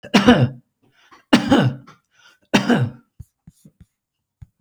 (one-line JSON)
{"three_cough_length": "4.6 s", "three_cough_amplitude": 32768, "three_cough_signal_mean_std_ratio": 0.38, "survey_phase": "beta (2021-08-13 to 2022-03-07)", "age": "65+", "gender": "Male", "wearing_mask": "No", "symptom_none": true, "smoker_status": "Ex-smoker", "respiratory_condition_asthma": false, "respiratory_condition_other": false, "recruitment_source": "REACT", "submission_delay": "2 days", "covid_test_result": "Positive", "covid_test_method": "RT-qPCR", "covid_ct_value": 31.7, "covid_ct_gene": "E gene", "influenza_a_test_result": "Negative", "influenza_b_test_result": "Negative"}